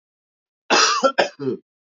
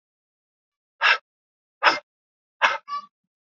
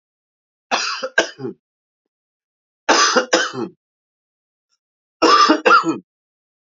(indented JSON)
{
  "cough_length": "1.9 s",
  "cough_amplitude": 32768,
  "cough_signal_mean_std_ratio": 0.47,
  "exhalation_length": "3.6 s",
  "exhalation_amplitude": 25465,
  "exhalation_signal_mean_std_ratio": 0.28,
  "three_cough_length": "6.7 s",
  "three_cough_amplitude": 29436,
  "three_cough_signal_mean_std_ratio": 0.39,
  "survey_phase": "alpha (2021-03-01 to 2021-08-12)",
  "age": "18-44",
  "gender": "Male",
  "wearing_mask": "No",
  "symptom_cough_any": true,
  "symptom_new_continuous_cough": true,
  "symptom_fatigue": true,
  "symptom_fever_high_temperature": true,
  "symptom_headache": true,
  "smoker_status": "Ex-smoker",
  "respiratory_condition_asthma": false,
  "respiratory_condition_other": false,
  "recruitment_source": "Test and Trace",
  "submission_delay": "2 days",
  "covid_test_result": "Positive",
  "covid_test_method": "RT-qPCR",
  "covid_ct_value": 26.0,
  "covid_ct_gene": "ORF1ab gene",
  "covid_ct_mean": 26.6,
  "covid_viral_load": "1900 copies/ml",
  "covid_viral_load_category": "Minimal viral load (< 10K copies/ml)"
}